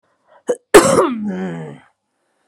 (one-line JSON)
{"cough_length": "2.5 s", "cough_amplitude": 32768, "cough_signal_mean_std_ratio": 0.41, "survey_phase": "beta (2021-08-13 to 2022-03-07)", "age": "18-44", "gender": "Female", "wearing_mask": "No", "symptom_none": true, "smoker_status": "Never smoked", "respiratory_condition_asthma": false, "respiratory_condition_other": false, "recruitment_source": "REACT", "submission_delay": "6 days", "covid_test_result": "Negative", "covid_test_method": "RT-qPCR"}